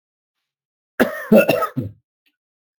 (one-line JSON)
{"cough_length": "2.8 s", "cough_amplitude": 31161, "cough_signal_mean_std_ratio": 0.33, "survey_phase": "alpha (2021-03-01 to 2021-08-12)", "age": "45-64", "gender": "Male", "wearing_mask": "Yes", "symptom_fatigue": true, "symptom_headache": true, "symptom_change_to_sense_of_smell_or_taste": true, "smoker_status": "Never smoked", "respiratory_condition_asthma": true, "respiratory_condition_other": false, "recruitment_source": "Test and Trace", "submission_delay": "2 days", "covid_test_result": "Positive", "covid_test_method": "RT-qPCR", "covid_ct_value": 21.1, "covid_ct_gene": "ORF1ab gene"}